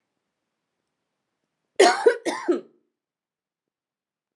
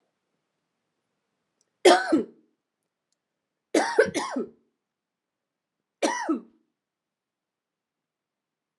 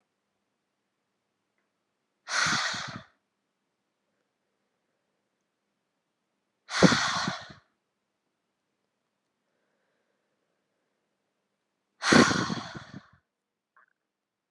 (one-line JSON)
{"cough_length": "4.4 s", "cough_amplitude": 23814, "cough_signal_mean_std_ratio": 0.26, "three_cough_length": "8.8 s", "three_cough_amplitude": 22045, "three_cough_signal_mean_std_ratio": 0.26, "exhalation_length": "14.5 s", "exhalation_amplitude": 19740, "exhalation_signal_mean_std_ratio": 0.24, "survey_phase": "beta (2021-08-13 to 2022-03-07)", "age": "18-44", "gender": "Female", "wearing_mask": "No", "symptom_runny_or_blocked_nose": true, "symptom_fatigue": true, "symptom_change_to_sense_of_smell_or_taste": true, "symptom_other": true, "smoker_status": "Never smoked", "respiratory_condition_asthma": false, "respiratory_condition_other": false, "recruitment_source": "Test and Trace", "submission_delay": "1 day", "covid_test_result": "Positive", "covid_test_method": "RT-qPCR", "covid_ct_value": 17.1, "covid_ct_gene": "ORF1ab gene", "covid_ct_mean": 17.9, "covid_viral_load": "1400000 copies/ml", "covid_viral_load_category": "High viral load (>1M copies/ml)"}